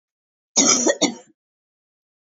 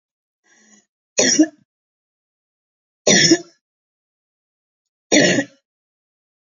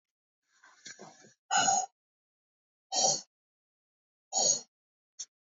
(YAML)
cough_length: 2.3 s
cough_amplitude: 30762
cough_signal_mean_std_ratio: 0.37
three_cough_length: 6.6 s
three_cough_amplitude: 32440
three_cough_signal_mean_std_ratio: 0.3
exhalation_length: 5.5 s
exhalation_amplitude: 6701
exhalation_signal_mean_std_ratio: 0.34
survey_phase: beta (2021-08-13 to 2022-03-07)
age: 45-64
gender: Female
wearing_mask: 'No'
symptom_sore_throat: true
symptom_onset: 13 days
smoker_status: Never smoked
respiratory_condition_asthma: false
respiratory_condition_other: false
recruitment_source: REACT
submission_delay: 3 days
covid_test_result: Negative
covid_test_method: RT-qPCR
influenza_a_test_result: Negative
influenza_b_test_result: Negative